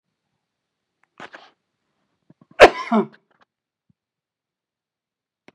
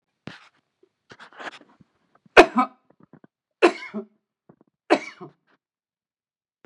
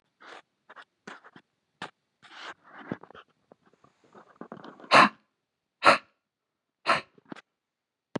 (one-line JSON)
{"cough_length": "5.5 s", "cough_amplitude": 32768, "cough_signal_mean_std_ratio": 0.15, "three_cough_length": "6.7 s", "three_cough_amplitude": 32768, "three_cough_signal_mean_std_ratio": 0.18, "exhalation_length": "8.2 s", "exhalation_amplitude": 27502, "exhalation_signal_mean_std_ratio": 0.2, "survey_phase": "beta (2021-08-13 to 2022-03-07)", "age": "45-64", "gender": "Male", "wearing_mask": "No", "symptom_headache": true, "symptom_onset": "12 days", "smoker_status": "Never smoked", "respiratory_condition_asthma": false, "respiratory_condition_other": false, "recruitment_source": "REACT", "submission_delay": "1 day", "covid_test_result": "Negative", "covid_test_method": "RT-qPCR", "influenza_a_test_result": "Negative", "influenza_b_test_result": "Negative"}